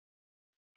{"three_cough_length": "0.8 s", "three_cough_amplitude": 16, "three_cough_signal_mean_std_ratio": 0.1, "survey_phase": "beta (2021-08-13 to 2022-03-07)", "age": "65+", "gender": "Female", "wearing_mask": "No", "symptom_headache": true, "smoker_status": "Ex-smoker", "respiratory_condition_asthma": false, "respiratory_condition_other": false, "recruitment_source": "REACT", "submission_delay": "2 days", "covid_test_result": "Negative", "covid_test_method": "RT-qPCR", "influenza_a_test_result": "Negative", "influenza_b_test_result": "Negative"}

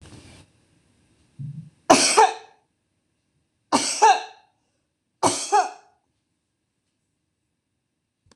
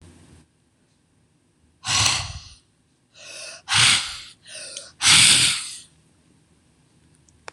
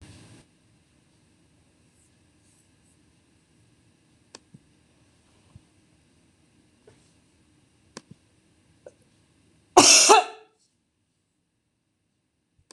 {"three_cough_length": "8.4 s", "three_cough_amplitude": 26028, "three_cough_signal_mean_std_ratio": 0.3, "exhalation_length": "7.5 s", "exhalation_amplitude": 26028, "exhalation_signal_mean_std_ratio": 0.37, "cough_length": "12.7 s", "cough_amplitude": 26027, "cough_signal_mean_std_ratio": 0.17, "survey_phase": "beta (2021-08-13 to 2022-03-07)", "age": "45-64", "gender": "Female", "wearing_mask": "No", "symptom_none": true, "smoker_status": "Never smoked", "respiratory_condition_asthma": false, "respiratory_condition_other": false, "recruitment_source": "REACT", "submission_delay": "3 days", "covid_test_result": "Negative", "covid_test_method": "RT-qPCR", "influenza_a_test_result": "Unknown/Void", "influenza_b_test_result": "Unknown/Void"}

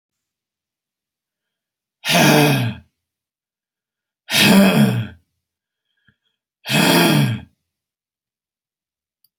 {"exhalation_length": "9.4 s", "exhalation_amplitude": 30741, "exhalation_signal_mean_std_ratio": 0.39, "survey_phase": "alpha (2021-03-01 to 2021-08-12)", "age": "65+", "gender": "Male", "wearing_mask": "No", "symptom_none": true, "smoker_status": "Ex-smoker", "respiratory_condition_asthma": false, "respiratory_condition_other": false, "recruitment_source": "REACT", "submission_delay": "1 day", "covid_test_result": "Negative", "covid_test_method": "RT-qPCR"}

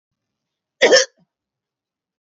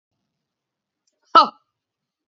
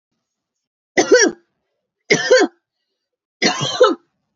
{"cough_length": "2.3 s", "cough_amplitude": 29244, "cough_signal_mean_std_ratio": 0.24, "exhalation_length": "2.3 s", "exhalation_amplitude": 32620, "exhalation_signal_mean_std_ratio": 0.17, "three_cough_length": "4.4 s", "three_cough_amplitude": 31491, "three_cough_signal_mean_std_ratio": 0.39, "survey_phase": "beta (2021-08-13 to 2022-03-07)", "age": "45-64", "gender": "Female", "wearing_mask": "No", "symptom_headache": true, "smoker_status": "Ex-smoker", "respiratory_condition_asthma": false, "respiratory_condition_other": false, "recruitment_source": "REACT", "submission_delay": "1 day", "covid_test_result": "Negative", "covid_test_method": "RT-qPCR", "influenza_a_test_result": "Unknown/Void", "influenza_b_test_result": "Unknown/Void"}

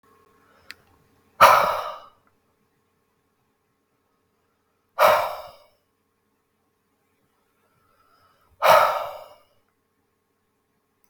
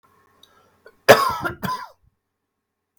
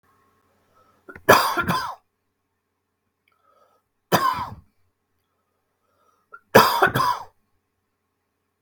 {"exhalation_length": "11.1 s", "exhalation_amplitude": 32766, "exhalation_signal_mean_std_ratio": 0.25, "cough_length": "3.0 s", "cough_amplitude": 32766, "cough_signal_mean_std_ratio": 0.26, "three_cough_length": "8.6 s", "three_cough_amplitude": 32768, "three_cough_signal_mean_std_ratio": 0.29, "survey_phase": "beta (2021-08-13 to 2022-03-07)", "age": "18-44", "gender": "Male", "wearing_mask": "No", "symptom_none": true, "symptom_onset": "4 days", "smoker_status": "Never smoked", "respiratory_condition_asthma": true, "respiratory_condition_other": false, "recruitment_source": "REACT", "submission_delay": "2 days", "covid_test_result": "Negative", "covid_test_method": "RT-qPCR"}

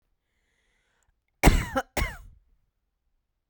{"cough_length": "3.5 s", "cough_amplitude": 21904, "cough_signal_mean_std_ratio": 0.24, "survey_phase": "beta (2021-08-13 to 2022-03-07)", "age": "18-44", "gender": "Female", "wearing_mask": "No", "symptom_none": true, "smoker_status": "Never smoked", "respiratory_condition_asthma": false, "respiratory_condition_other": false, "recruitment_source": "REACT", "submission_delay": "2 days", "covid_test_result": "Negative", "covid_test_method": "RT-qPCR"}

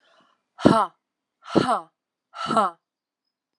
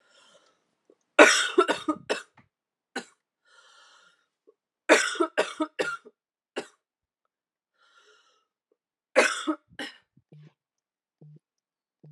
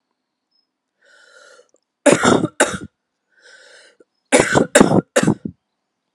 {"exhalation_length": "3.6 s", "exhalation_amplitude": 29797, "exhalation_signal_mean_std_ratio": 0.33, "three_cough_length": "12.1 s", "three_cough_amplitude": 30647, "three_cough_signal_mean_std_ratio": 0.25, "cough_length": "6.1 s", "cough_amplitude": 32768, "cough_signal_mean_std_ratio": 0.34, "survey_phase": "alpha (2021-03-01 to 2021-08-12)", "age": "18-44", "gender": "Female", "wearing_mask": "No", "symptom_cough_any": true, "symptom_new_continuous_cough": true, "symptom_fatigue": true, "symptom_fever_high_temperature": true, "symptom_headache": true, "symptom_change_to_sense_of_smell_or_taste": true, "symptom_onset": "4 days", "smoker_status": "Never smoked", "respiratory_condition_asthma": false, "respiratory_condition_other": false, "recruitment_source": "Test and Trace", "submission_delay": "1 day", "covid_test_result": "Positive", "covid_test_method": "RT-qPCR", "covid_ct_value": 15.5, "covid_ct_gene": "ORF1ab gene", "covid_ct_mean": 16.1, "covid_viral_load": "5400000 copies/ml", "covid_viral_load_category": "High viral load (>1M copies/ml)"}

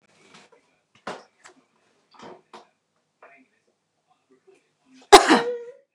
{"cough_length": "5.9 s", "cough_amplitude": 29204, "cough_signal_mean_std_ratio": 0.18, "survey_phase": "beta (2021-08-13 to 2022-03-07)", "age": "18-44", "gender": "Female", "wearing_mask": "Yes", "symptom_none": true, "smoker_status": "Ex-smoker", "respiratory_condition_asthma": false, "respiratory_condition_other": false, "recruitment_source": "REACT", "submission_delay": "0 days", "covid_test_result": "Negative", "covid_test_method": "RT-qPCR", "influenza_a_test_result": "Negative", "influenza_b_test_result": "Negative"}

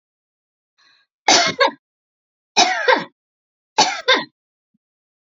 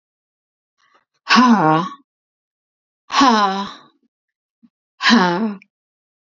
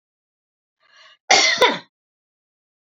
{"three_cough_length": "5.3 s", "three_cough_amplitude": 32767, "three_cough_signal_mean_std_ratio": 0.35, "exhalation_length": "6.3 s", "exhalation_amplitude": 31160, "exhalation_signal_mean_std_ratio": 0.4, "cough_length": "3.0 s", "cough_amplitude": 32768, "cough_signal_mean_std_ratio": 0.3, "survey_phase": "beta (2021-08-13 to 2022-03-07)", "age": "45-64", "gender": "Female", "wearing_mask": "No", "symptom_none": true, "smoker_status": "Never smoked", "respiratory_condition_asthma": false, "respiratory_condition_other": false, "recruitment_source": "REACT", "submission_delay": "2 days", "covid_test_result": "Negative", "covid_test_method": "RT-qPCR", "influenza_a_test_result": "Negative", "influenza_b_test_result": "Negative"}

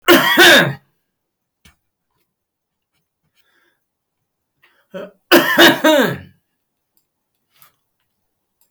{"cough_length": "8.7 s", "cough_amplitude": 32768, "cough_signal_mean_std_ratio": 0.33, "survey_phase": "beta (2021-08-13 to 2022-03-07)", "age": "65+", "gender": "Male", "wearing_mask": "No", "symptom_none": true, "smoker_status": "Never smoked", "respiratory_condition_asthma": false, "respiratory_condition_other": false, "recruitment_source": "REACT", "submission_delay": "1 day", "covid_test_result": "Negative", "covid_test_method": "RT-qPCR"}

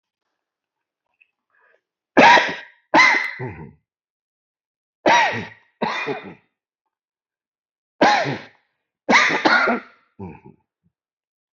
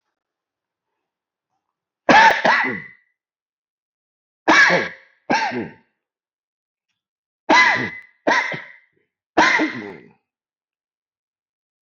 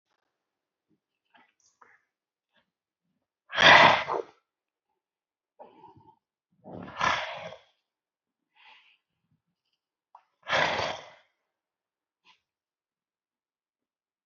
{"three_cough_length": "11.5 s", "three_cough_amplitude": 28107, "three_cough_signal_mean_std_ratio": 0.36, "cough_length": "11.9 s", "cough_amplitude": 28852, "cough_signal_mean_std_ratio": 0.35, "exhalation_length": "14.3 s", "exhalation_amplitude": 22827, "exhalation_signal_mean_std_ratio": 0.21, "survey_phase": "beta (2021-08-13 to 2022-03-07)", "age": "65+", "gender": "Male", "wearing_mask": "Yes", "symptom_none": true, "smoker_status": "Never smoked", "respiratory_condition_asthma": false, "respiratory_condition_other": false, "recruitment_source": "REACT", "submission_delay": "1 day", "covid_test_result": "Positive", "covid_test_method": "RT-qPCR", "covid_ct_value": 37.0, "covid_ct_gene": "N gene", "influenza_a_test_result": "Negative", "influenza_b_test_result": "Negative"}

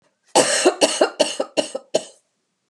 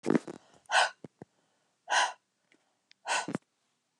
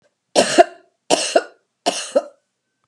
{"cough_length": "2.7 s", "cough_amplitude": 32397, "cough_signal_mean_std_ratio": 0.46, "exhalation_length": "4.0 s", "exhalation_amplitude": 9889, "exhalation_signal_mean_std_ratio": 0.33, "three_cough_length": "2.9 s", "three_cough_amplitude": 32768, "three_cough_signal_mean_std_ratio": 0.36, "survey_phase": "beta (2021-08-13 to 2022-03-07)", "age": "45-64", "gender": "Female", "wearing_mask": "No", "symptom_none": true, "smoker_status": "Never smoked", "respiratory_condition_asthma": false, "respiratory_condition_other": false, "recruitment_source": "REACT", "submission_delay": "1 day", "covid_test_result": "Negative", "covid_test_method": "RT-qPCR"}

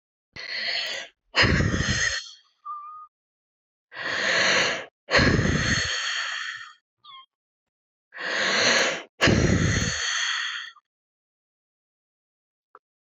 {"exhalation_length": "13.1 s", "exhalation_amplitude": 17502, "exhalation_signal_mean_std_ratio": 0.57, "survey_phase": "beta (2021-08-13 to 2022-03-07)", "age": "45-64", "gender": "Female", "wearing_mask": "No", "symptom_cough_any": true, "symptom_runny_or_blocked_nose": true, "symptom_sore_throat": true, "symptom_headache": true, "symptom_change_to_sense_of_smell_or_taste": true, "symptom_loss_of_taste": true, "symptom_onset": "5 days", "smoker_status": "Never smoked", "respiratory_condition_asthma": true, "respiratory_condition_other": false, "recruitment_source": "Test and Trace", "submission_delay": "2 days", "covid_test_result": "Positive", "covid_test_method": "RT-qPCR", "covid_ct_value": 16.3, "covid_ct_gene": "ORF1ab gene", "covid_ct_mean": 16.8, "covid_viral_load": "3100000 copies/ml", "covid_viral_load_category": "High viral load (>1M copies/ml)"}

